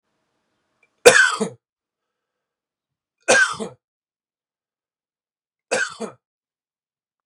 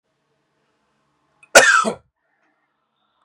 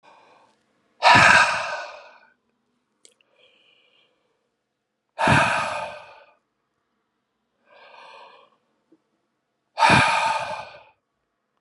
{"three_cough_length": "7.3 s", "three_cough_amplitude": 32768, "three_cough_signal_mean_std_ratio": 0.24, "cough_length": "3.2 s", "cough_amplitude": 32768, "cough_signal_mean_std_ratio": 0.25, "exhalation_length": "11.6 s", "exhalation_amplitude": 29335, "exhalation_signal_mean_std_ratio": 0.33, "survey_phase": "beta (2021-08-13 to 2022-03-07)", "age": "45-64", "gender": "Male", "wearing_mask": "No", "symptom_runny_or_blocked_nose": true, "smoker_status": "Never smoked", "respiratory_condition_asthma": false, "respiratory_condition_other": false, "recruitment_source": "Test and Trace", "submission_delay": "2 days", "covid_test_result": "Positive", "covid_test_method": "RT-qPCR", "covid_ct_value": 22.7, "covid_ct_gene": "S gene"}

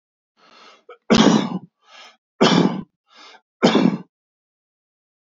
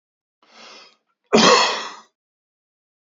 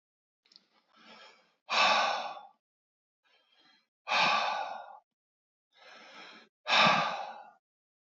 {"three_cough_length": "5.4 s", "three_cough_amplitude": 30856, "three_cough_signal_mean_std_ratio": 0.36, "cough_length": "3.2 s", "cough_amplitude": 27371, "cough_signal_mean_std_ratio": 0.32, "exhalation_length": "8.2 s", "exhalation_amplitude": 9261, "exhalation_signal_mean_std_ratio": 0.39, "survey_phase": "beta (2021-08-13 to 2022-03-07)", "age": "45-64", "gender": "Male", "wearing_mask": "No", "symptom_sore_throat": true, "smoker_status": "Ex-smoker", "respiratory_condition_asthma": false, "respiratory_condition_other": false, "recruitment_source": "REACT", "submission_delay": "2 days", "covid_test_result": "Negative", "covid_test_method": "RT-qPCR", "influenza_a_test_result": "Unknown/Void", "influenza_b_test_result": "Unknown/Void"}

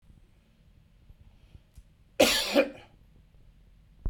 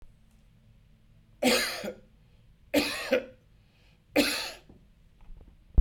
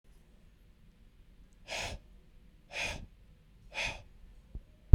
{"cough_length": "4.1 s", "cough_amplitude": 16993, "cough_signal_mean_std_ratio": 0.3, "three_cough_length": "5.8 s", "three_cough_amplitude": 10747, "three_cough_signal_mean_std_ratio": 0.36, "exhalation_length": "4.9 s", "exhalation_amplitude": 29571, "exhalation_signal_mean_std_ratio": 0.13, "survey_phase": "beta (2021-08-13 to 2022-03-07)", "age": "45-64", "gender": "Male", "wearing_mask": "No", "symptom_none": true, "smoker_status": "Ex-smoker", "respiratory_condition_asthma": false, "respiratory_condition_other": true, "recruitment_source": "REACT", "submission_delay": "2 days", "covid_test_result": "Negative", "covid_test_method": "RT-qPCR"}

